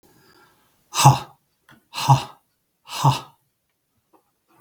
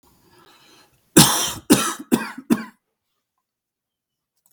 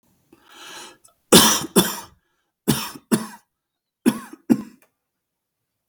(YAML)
exhalation_length: 4.6 s
exhalation_amplitude: 32768
exhalation_signal_mean_std_ratio: 0.27
cough_length: 4.5 s
cough_amplitude: 32768
cough_signal_mean_std_ratio: 0.3
three_cough_length: 5.9 s
three_cough_amplitude: 32768
three_cough_signal_mean_std_ratio: 0.3
survey_phase: beta (2021-08-13 to 2022-03-07)
age: 18-44
gender: Male
wearing_mask: 'No'
symptom_shortness_of_breath: true
symptom_fatigue: true
symptom_headache: true
symptom_other: true
smoker_status: Never smoked
respiratory_condition_asthma: true
respiratory_condition_other: false
recruitment_source: REACT
submission_delay: 0 days
covid_test_result: Negative
covid_test_method: RT-qPCR
influenza_a_test_result: Negative
influenza_b_test_result: Negative